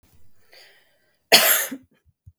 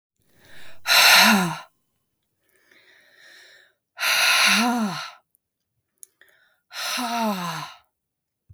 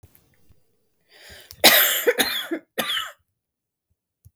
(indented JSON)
{
  "cough_length": "2.4 s",
  "cough_amplitude": 32768,
  "cough_signal_mean_std_ratio": 0.31,
  "exhalation_length": "8.5 s",
  "exhalation_amplitude": 28453,
  "exhalation_signal_mean_std_ratio": 0.43,
  "three_cough_length": "4.4 s",
  "three_cough_amplitude": 32768,
  "three_cough_signal_mean_std_ratio": 0.36,
  "survey_phase": "beta (2021-08-13 to 2022-03-07)",
  "age": "18-44",
  "gender": "Female",
  "wearing_mask": "No",
  "symptom_cough_any": true,
  "symptom_sore_throat": true,
  "symptom_headache": true,
  "symptom_onset": "12 days",
  "smoker_status": "Never smoked",
  "respiratory_condition_asthma": false,
  "respiratory_condition_other": false,
  "recruitment_source": "REACT",
  "submission_delay": "2 days",
  "covid_test_result": "Negative",
  "covid_test_method": "RT-qPCR",
  "influenza_a_test_result": "Negative",
  "influenza_b_test_result": "Negative"
}